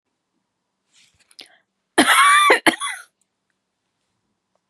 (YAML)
cough_length: 4.7 s
cough_amplitude: 30862
cough_signal_mean_std_ratio: 0.33
survey_phase: beta (2021-08-13 to 2022-03-07)
age: 45-64
gender: Female
wearing_mask: 'No'
symptom_none: true
smoker_status: Never smoked
respiratory_condition_asthma: false
respiratory_condition_other: false
recruitment_source: REACT
submission_delay: 6 days
covid_test_result: Negative
covid_test_method: RT-qPCR
influenza_a_test_result: Negative
influenza_b_test_result: Negative